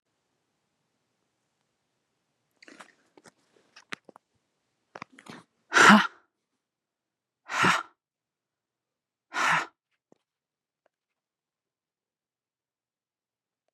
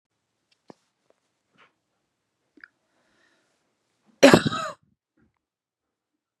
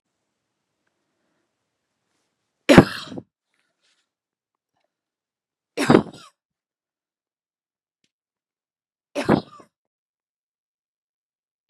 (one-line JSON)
{"exhalation_length": "13.7 s", "exhalation_amplitude": 25400, "exhalation_signal_mean_std_ratio": 0.18, "cough_length": "6.4 s", "cough_amplitude": 32768, "cough_signal_mean_std_ratio": 0.15, "three_cough_length": "11.7 s", "three_cough_amplitude": 32768, "three_cough_signal_mean_std_ratio": 0.15, "survey_phase": "beta (2021-08-13 to 2022-03-07)", "age": "45-64", "gender": "Female", "wearing_mask": "No", "symptom_cough_any": true, "symptom_shortness_of_breath": true, "symptom_fatigue": true, "symptom_headache": true, "symptom_onset": "3 days", "smoker_status": "Never smoked", "respiratory_condition_asthma": false, "respiratory_condition_other": false, "recruitment_source": "Test and Trace", "submission_delay": "2 days", "covid_test_result": "Positive", "covid_test_method": "RT-qPCR", "covid_ct_value": 25.8, "covid_ct_gene": "N gene"}